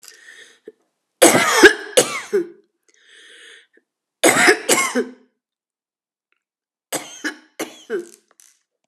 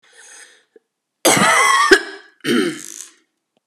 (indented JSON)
{
  "three_cough_length": "8.9 s",
  "three_cough_amplitude": 32768,
  "three_cough_signal_mean_std_ratio": 0.33,
  "cough_length": "3.7 s",
  "cough_amplitude": 32768,
  "cough_signal_mean_std_ratio": 0.46,
  "survey_phase": "alpha (2021-03-01 to 2021-08-12)",
  "age": "45-64",
  "gender": "Female",
  "wearing_mask": "No",
  "symptom_cough_any": true,
  "symptom_headache": true,
  "smoker_status": "Never smoked",
  "respiratory_condition_asthma": false,
  "respiratory_condition_other": false,
  "recruitment_source": "Test and Trace",
  "submission_delay": "3 days",
  "covid_test_result": "Positive",
  "covid_test_method": "RT-qPCR",
  "covid_ct_value": 34.1,
  "covid_ct_gene": "ORF1ab gene",
  "covid_ct_mean": 34.1,
  "covid_viral_load": "6.7 copies/ml",
  "covid_viral_load_category": "Minimal viral load (< 10K copies/ml)"
}